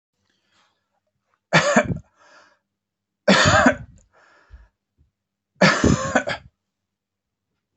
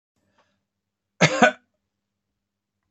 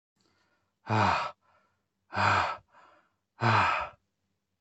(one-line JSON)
{"three_cough_length": "7.8 s", "three_cough_amplitude": 24812, "three_cough_signal_mean_std_ratio": 0.34, "cough_length": "2.9 s", "cough_amplitude": 30038, "cough_signal_mean_std_ratio": 0.22, "exhalation_length": "4.6 s", "exhalation_amplitude": 9556, "exhalation_signal_mean_std_ratio": 0.44, "survey_phase": "beta (2021-08-13 to 2022-03-07)", "age": "45-64", "gender": "Male", "wearing_mask": "No", "symptom_none": true, "smoker_status": "Never smoked", "respiratory_condition_asthma": false, "respiratory_condition_other": false, "recruitment_source": "REACT", "submission_delay": "2 days", "covid_test_result": "Negative", "covid_test_method": "RT-qPCR"}